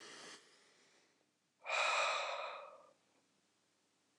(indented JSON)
{
  "exhalation_length": "4.2 s",
  "exhalation_amplitude": 1955,
  "exhalation_signal_mean_std_ratio": 0.42,
  "survey_phase": "beta (2021-08-13 to 2022-03-07)",
  "age": "45-64",
  "gender": "Male",
  "wearing_mask": "No",
  "symptom_none": true,
  "smoker_status": "Never smoked",
  "respiratory_condition_asthma": false,
  "respiratory_condition_other": false,
  "recruitment_source": "REACT",
  "submission_delay": "1 day",
  "covid_test_result": "Negative",
  "covid_test_method": "RT-qPCR"
}